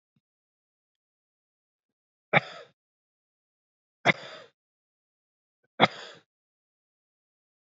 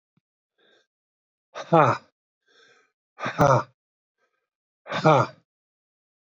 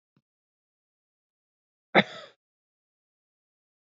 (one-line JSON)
{"three_cough_length": "7.8 s", "three_cough_amplitude": 20691, "three_cough_signal_mean_std_ratio": 0.14, "exhalation_length": "6.3 s", "exhalation_amplitude": 22889, "exhalation_signal_mean_std_ratio": 0.28, "cough_length": "3.8 s", "cough_amplitude": 23926, "cough_signal_mean_std_ratio": 0.12, "survey_phase": "beta (2021-08-13 to 2022-03-07)", "age": "45-64", "gender": "Male", "wearing_mask": "No", "symptom_none": true, "smoker_status": "Ex-smoker", "respiratory_condition_asthma": true, "respiratory_condition_other": false, "recruitment_source": "REACT", "submission_delay": "1 day", "covid_test_result": "Negative", "covid_test_method": "RT-qPCR"}